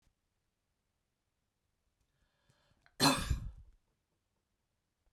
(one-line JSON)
{"cough_length": "5.1 s", "cough_amplitude": 5888, "cough_signal_mean_std_ratio": 0.22, "survey_phase": "beta (2021-08-13 to 2022-03-07)", "age": "45-64", "gender": "Female", "wearing_mask": "No", "symptom_none": true, "symptom_onset": "12 days", "smoker_status": "Never smoked", "respiratory_condition_asthma": false, "respiratory_condition_other": false, "recruitment_source": "REACT", "submission_delay": "2 days", "covid_test_result": "Negative", "covid_test_method": "RT-qPCR"}